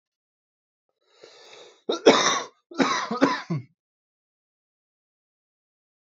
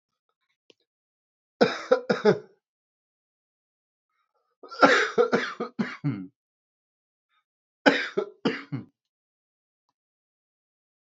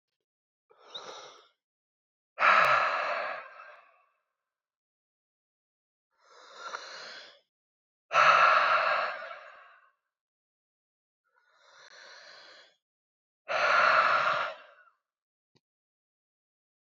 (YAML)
cough_length: 6.1 s
cough_amplitude: 27085
cough_signal_mean_std_ratio: 0.3
three_cough_length: 11.1 s
three_cough_amplitude: 27574
three_cough_signal_mean_std_ratio: 0.29
exhalation_length: 17.0 s
exhalation_amplitude: 10526
exhalation_signal_mean_std_ratio: 0.36
survey_phase: alpha (2021-03-01 to 2021-08-12)
age: 18-44
gender: Male
wearing_mask: 'No'
symptom_fatigue: true
symptom_fever_high_temperature: true
symptom_change_to_sense_of_smell_or_taste: true
symptom_loss_of_taste: true
smoker_status: Ex-smoker
respiratory_condition_asthma: false
respiratory_condition_other: false
recruitment_source: Test and Trace
submission_delay: 1 day
covid_test_result: Positive
covid_test_method: RT-qPCR